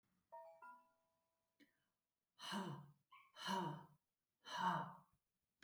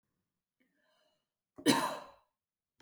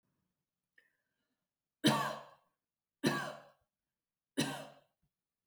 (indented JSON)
{
  "exhalation_length": "5.6 s",
  "exhalation_amplitude": 1066,
  "exhalation_signal_mean_std_ratio": 0.41,
  "cough_length": "2.8 s",
  "cough_amplitude": 7076,
  "cough_signal_mean_std_ratio": 0.25,
  "three_cough_length": "5.5 s",
  "three_cough_amplitude": 5805,
  "three_cough_signal_mean_std_ratio": 0.29,
  "survey_phase": "beta (2021-08-13 to 2022-03-07)",
  "age": "45-64",
  "gender": "Female",
  "wearing_mask": "No",
  "symptom_none": true,
  "smoker_status": "Prefer not to say",
  "respiratory_condition_asthma": false,
  "respiratory_condition_other": false,
  "recruitment_source": "Test and Trace",
  "submission_delay": "1 day",
  "covid_test_result": "Negative",
  "covid_test_method": "RT-qPCR"
}